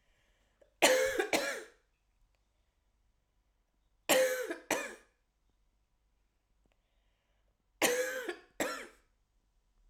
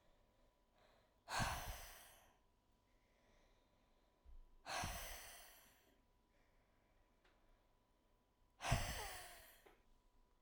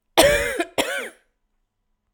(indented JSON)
{
  "three_cough_length": "9.9 s",
  "three_cough_amplitude": 10521,
  "three_cough_signal_mean_std_ratio": 0.34,
  "exhalation_length": "10.4 s",
  "exhalation_amplitude": 2307,
  "exhalation_signal_mean_std_ratio": 0.37,
  "cough_length": "2.1 s",
  "cough_amplitude": 32767,
  "cough_signal_mean_std_ratio": 0.43,
  "survey_phase": "alpha (2021-03-01 to 2021-08-12)",
  "age": "18-44",
  "gender": "Female",
  "wearing_mask": "No",
  "symptom_shortness_of_breath": true,
  "symptom_abdominal_pain": true,
  "symptom_diarrhoea": true,
  "symptom_fatigue": true,
  "symptom_headache": true,
  "symptom_onset": "4 days",
  "smoker_status": "Never smoked",
  "respiratory_condition_asthma": false,
  "respiratory_condition_other": false,
  "recruitment_source": "Test and Trace",
  "submission_delay": "1 day",
  "covid_test_result": "Positive",
  "covid_test_method": "RT-qPCR",
  "covid_ct_value": 31.0,
  "covid_ct_gene": "ORF1ab gene",
  "covid_ct_mean": 32.0,
  "covid_viral_load": "31 copies/ml",
  "covid_viral_load_category": "Minimal viral load (< 10K copies/ml)"
}